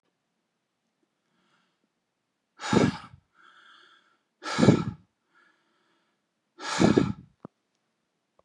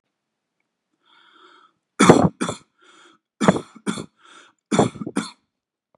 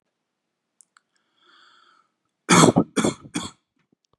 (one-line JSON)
{"exhalation_length": "8.4 s", "exhalation_amplitude": 19962, "exhalation_signal_mean_std_ratio": 0.26, "three_cough_length": "6.0 s", "three_cough_amplitude": 32768, "three_cough_signal_mean_std_ratio": 0.28, "cough_length": "4.2 s", "cough_amplitude": 32729, "cough_signal_mean_std_ratio": 0.26, "survey_phase": "beta (2021-08-13 to 2022-03-07)", "age": "45-64", "gender": "Male", "wearing_mask": "No", "symptom_none": true, "smoker_status": "Never smoked", "respiratory_condition_asthma": false, "respiratory_condition_other": false, "recruitment_source": "REACT", "submission_delay": "1 day", "covid_test_result": "Negative", "covid_test_method": "RT-qPCR", "influenza_a_test_result": "Negative", "influenza_b_test_result": "Negative"}